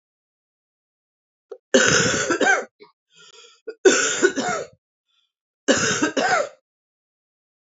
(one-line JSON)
{"three_cough_length": "7.7 s", "three_cough_amplitude": 28401, "three_cough_signal_mean_std_ratio": 0.43, "survey_phase": "beta (2021-08-13 to 2022-03-07)", "age": "45-64", "gender": "Female", "wearing_mask": "No", "symptom_cough_any": true, "symptom_runny_or_blocked_nose": true, "symptom_shortness_of_breath": true, "symptom_abdominal_pain": true, "symptom_diarrhoea": true, "symptom_fatigue": true, "symptom_other": true, "symptom_onset": "5 days", "smoker_status": "Ex-smoker", "respiratory_condition_asthma": false, "respiratory_condition_other": false, "recruitment_source": "Test and Trace", "submission_delay": "2 days", "covid_test_result": "Positive", "covid_test_method": "RT-qPCR", "covid_ct_value": 27.2, "covid_ct_gene": "ORF1ab gene", "covid_ct_mean": 27.6, "covid_viral_load": "880 copies/ml", "covid_viral_load_category": "Minimal viral load (< 10K copies/ml)"}